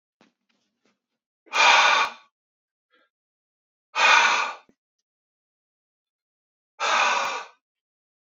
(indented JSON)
{
  "exhalation_length": "8.3 s",
  "exhalation_amplitude": 25382,
  "exhalation_signal_mean_std_ratio": 0.35,
  "survey_phase": "beta (2021-08-13 to 2022-03-07)",
  "age": "18-44",
  "gender": "Male",
  "wearing_mask": "No",
  "symptom_none": true,
  "symptom_onset": "13 days",
  "smoker_status": "Never smoked",
  "respiratory_condition_asthma": false,
  "respiratory_condition_other": false,
  "recruitment_source": "REACT",
  "submission_delay": "2 days",
  "covid_test_result": "Negative",
  "covid_test_method": "RT-qPCR",
  "influenza_a_test_result": "Unknown/Void",
  "influenza_b_test_result": "Unknown/Void"
}